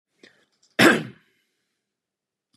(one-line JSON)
{"cough_length": "2.6 s", "cough_amplitude": 30309, "cough_signal_mean_std_ratio": 0.23, "survey_phase": "beta (2021-08-13 to 2022-03-07)", "age": "45-64", "gender": "Male", "wearing_mask": "No", "symptom_none": true, "smoker_status": "Ex-smoker", "respiratory_condition_asthma": false, "respiratory_condition_other": false, "recruitment_source": "REACT", "submission_delay": "3 days", "covid_test_result": "Negative", "covid_test_method": "RT-qPCR", "influenza_a_test_result": "Unknown/Void", "influenza_b_test_result": "Unknown/Void"}